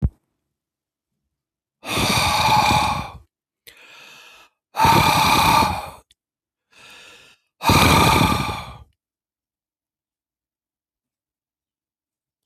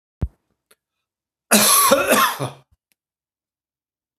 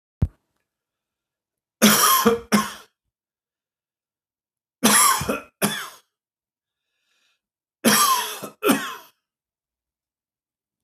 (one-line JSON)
{"exhalation_length": "12.5 s", "exhalation_amplitude": 30827, "exhalation_signal_mean_std_ratio": 0.43, "cough_length": "4.2 s", "cough_amplitude": 32768, "cough_signal_mean_std_ratio": 0.38, "three_cough_length": "10.8 s", "three_cough_amplitude": 32631, "three_cough_signal_mean_std_ratio": 0.36, "survey_phase": "beta (2021-08-13 to 2022-03-07)", "age": "65+", "gender": "Male", "wearing_mask": "No", "symptom_none": true, "smoker_status": "Ex-smoker", "respiratory_condition_asthma": false, "respiratory_condition_other": false, "recruitment_source": "REACT", "submission_delay": "3 days", "covid_test_result": "Negative", "covid_test_method": "RT-qPCR", "influenza_a_test_result": "Negative", "influenza_b_test_result": "Negative"}